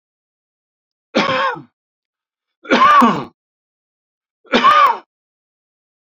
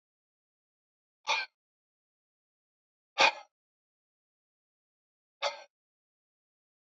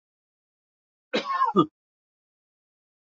{"three_cough_length": "6.1 s", "three_cough_amplitude": 30189, "three_cough_signal_mean_std_ratio": 0.38, "exhalation_length": "6.9 s", "exhalation_amplitude": 10782, "exhalation_signal_mean_std_ratio": 0.17, "cough_length": "3.2 s", "cough_amplitude": 15711, "cough_signal_mean_std_ratio": 0.28, "survey_phase": "beta (2021-08-13 to 2022-03-07)", "age": "45-64", "gender": "Male", "wearing_mask": "No", "symptom_diarrhoea": true, "smoker_status": "Never smoked", "respiratory_condition_asthma": false, "respiratory_condition_other": false, "recruitment_source": "REACT", "submission_delay": "3 days", "covid_test_result": "Negative", "covid_test_method": "RT-qPCR", "influenza_a_test_result": "Negative", "influenza_b_test_result": "Negative"}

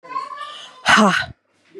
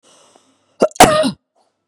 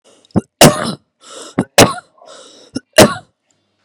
{"exhalation_length": "1.8 s", "exhalation_amplitude": 29996, "exhalation_signal_mean_std_ratio": 0.46, "cough_length": "1.9 s", "cough_amplitude": 32768, "cough_signal_mean_std_ratio": 0.34, "three_cough_length": "3.8 s", "three_cough_amplitude": 32768, "three_cough_signal_mean_std_ratio": 0.33, "survey_phase": "beta (2021-08-13 to 2022-03-07)", "age": "18-44", "gender": "Female", "wearing_mask": "No", "symptom_runny_or_blocked_nose": true, "smoker_status": "Never smoked", "respiratory_condition_asthma": false, "respiratory_condition_other": false, "recruitment_source": "REACT", "submission_delay": "2 days", "covid_test_result": "Negative", "covid_test_method": "RT-qPCR", "influenza_a_test_result": "Negative", "influenza_b_test_result": "Negative"}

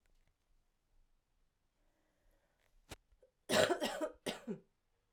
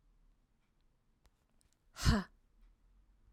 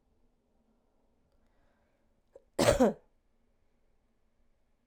{"three_cough_length": "5.1 s", "three_cough_amplitude": 4810, "three_cough_signal_mean_std_ratio": 0.28, "exhalation_length": "3.3 s", "exhalation_amplitude": 5294, "exhalation_signal_mean_std_ratio": 0.22, "cough_length": "4.9 s", "cough_amplitude": 9723, "cough_signal_mean_std_ratio": 0.21, "survey_phase": "alpha (2021-03-01 to 2021-08-12)", "age": "18-44", "gender": "Female", "wearing_mask": "No", "symptom_headache": true, "symptom_change_to_sense_of_smell_or_taste": true, "symptom_onset": "5 days", "smoker_status": "Never smoked", "respiratory_condition_asthma": true, "respiratory_condition_other": false, "recruitment_source": "Test and Trace", "submission_delay": "2 days", "covid_test_result": "Positive", "covid_test_method": "RT-qPCR"}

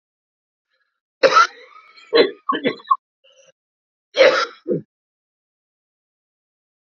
{"cough_length": "6.8 s", "cough_amplitude": 30018, "cough_signal_mean_std_ratio": 0.3, "survey_phase": "beta (2021-08-13 to 2022-03-07)", "age": "45-64", "gender": "Male", "wearing_mask": "No", "symptom_cough_any": true, "symptom_runny_or_blocked_nose": true, "symptom_sore_throat": true, "symptom_fatigue": true, "symptom_headache": true, "symptom_onset": "2 days", "smoker_status": "Ex-smoker", "respiratory_condition_asthma": false, "respiratory_condition_other": false, "recruitment_source": "Test and Trace", "submission_delay": "2 days", "covid_test_result": "Positive", "covid_test_method": "LAMP"}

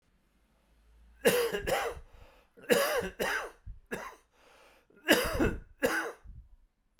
{"three_cough_length": "7.0 s", "three_cough_amplitude": 12455, "three_cough_signal_mean_std_ratio": 0.47, "survey_phase": "beta (2021-08-13 to 2022-03-07)", "age": "45-64", "gender": "Male", "wearing_mask": "No", "symptom_cough_any": true, "symptom_runny_or_blocked_nose": true, "symptom_onset": "6 days", "smoker_status": "Never smoked", "respiratory_condition_asthma": false, "respiratory_condition_other": false, "recruitment_source": "Test and Trace", "submission_delay": "3 days", "covid_test_result": "Positive", "covid_test_method": "RT-qPCR", "covid_ct_value": 10.8, "covid_ct_gene": "ORF1ab gene", "covid_ct_mean": 11.9, "covid_viral_load": "130000000 copies/ml", "covid_viral_load_category": "High viral load (>1M copies/ml)"}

